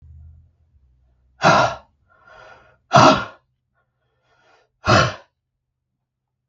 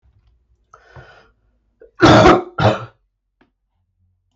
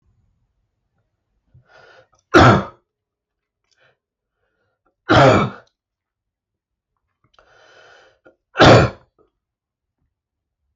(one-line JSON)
{"exhalation_length": "6.5 s", "exhalation_amplitude": 32768, "exhalation_signal_mean_std_ratio": 0.29, "cough_length": "4.4 s", "cough_amplitude": 32768, "cough_signal_mean_std_ratio": 0.31, "three_cough_length": "10.8 s", "three_cough_amplitude": 32768, "three_cough_signal_mean_std_ratio": 0.25, "survey_phase": "beta (2021-08-13 to 2022-03-07)", "age": "45-64", "gender": "Male", "wearing_mask": "No", "symptom_cough_any": true, "symptom_runny_or_blocked_nose": true, "symptom_sore_throat": true, "symptom_headache": true, "smoker_status": "Never smoked", "respiratory_condition_asthma": false, "respiratory_condition_other": false, "recruitment_source": "Test and Trace", "submission_delay": "2 days", "covid_test_result": "Positive", "covid_test_method": "RT-qPCR"}